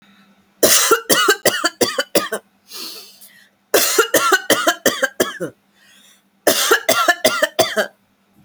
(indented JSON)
{
  "three_cough_length": "8.4 s",
  "three_cough_amplitude": 32768,
  "three_cough_signal_mean_std_ratio": 0.52,
  "survey_phase": "alpha (2021-03-01 to 2021-08-12)",
  "age": "18-44",
  "gender": "Female",
  "wearing_mask": "No",
  "symptom_none": true,
  "smoker_status": "Never smoked",
  "respiratory_condition_asthma": false,
  "respiratory_condition_other": false,
  "recruitment_source": "REACT",
  "submission_delay": "18 days",
  "covid_test_result": "Negative",
  "covid_test_method": "RT-qPCR"
}